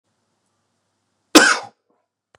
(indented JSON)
{
  "cough_length": "2.4 s",
  "cough_amplitude": 32768,
  "cough_signal_mean_std_ratio": 0.23,
  "survey_phase": "beta (2021-08-13 to 2022-03-07)",
  "age": "18-44",
  "gender": "Male",
  "wearing_mask": "No",
  "symptom_cough_any": true,
  "symptom_runny_or_blocked_nose": true,
  "symptom_diarrhoea": true,
  "symptom_fatigue": true,
  "symptom_headache": true,
  "smoker_status": "Never smoked",
  "respiratory_condition_asthma": false,
  "respiratory_condition_other": false,
  "recruitment_source": "Test and Trace",
  "submission_delay": "2 days",
  "covid_test_result": "Positive",
  "covid_test_method": "RT-qPCR"
}